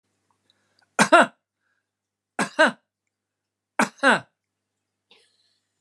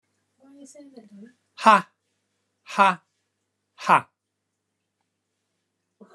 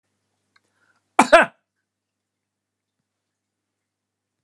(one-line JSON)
{"three_cough_length": "5.8 s", "three_cough_amplitude": 31264, "three_cough_signal_mean_std_ratio": 0.24, "exhalation_length": "6.1 s", "exhalation_amplitude": 28608, "exhalation_signal_mean_std_ratio": 0.21, "cough_length": "4.4 s", "cough_amplitude": 32767, "cough_signal_mean_std_ratio": 0.15, "survey_phase": "alpha (2021-03-01 to 2021-08-12)", "age": "65+", "gender": "Male", "wearing_mask": "No", "symptom_none": true, "smoker_status": "Never smoked", "respiratory_condition_asthma": false, "respiratory_condition_other": false, "recruitment_source": "REACT", "submission_delay": "2 days", "covid_test_result": "Negative", "covid_test_method": "RT-qPCR"}